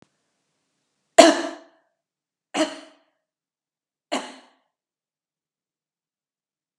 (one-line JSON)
{"three_cough_length": "6.8 s", "three_cough_amplitude": 32768, "three_cough_signal_mean_std_ratio": 0.17, "survey_phase": "beta (2021-08-13 to 2022-03-07)", "age": "45-64", "gender": "Female", "wearing_mask": "No", "symptom_none": true, "smoker_status": "Never smoked", "respiratory_condition_asthma": false, "respiratory_condition_other": false, "recruitment_source": "REACT", "submission_delay": "1 day", "covid_test_result": "Negative", "covid_test_method": "RT-qPCR", "influenza_a_test_result": "Negative", "influenza_b_test_result": "Negative"}